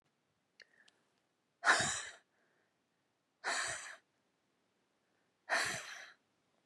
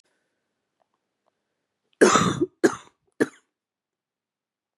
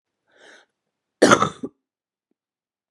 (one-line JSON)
{"exhalation_length": "6.7 s", "exhalation_amplitude": 5631, "exhalation_signal_mean_std_ratio": 0.32, "three_cough_length": "4.8 s", "three_cough_amplitude": 24572, "three_cough_signal_mean_std_ratio": 0.25, "cough_length": "2.9 s", "cough_amplitude": 32767, "cough_signal_mean_std_ratio": 0.22, "survey_phase": "beta (2021-08-13 to 2022-03-07)", "age": "45-64", "gender": "Female", "wearing_mask": "No", "symptom_cough_any": true, "symptom_runny_or_blocked_nose": true, "symptom_fatigue": true, "symptom_change_to_sense_of_smell_or_taste": true, "symptom_other": true, "symptom_onset": "3 days", "smoker_status": "Never smoked", "respiratory_condition_asthma": true, "respiratory_condition_other": false, "recruitment_source": "Test and Trace", "submission_delay": "2 days", "covid_test_result": "Positive", "covid_test_method": "RT-qPCR", "covid_ct_value": 23.4, "covid_ct_gene": "ORF1ab gene", "covid_ct_mean": 23.7, "covid_viral_load": "17000 copies/ml", "covid_viral_load_category": "Low viral load (10K-1M copies/ml)"}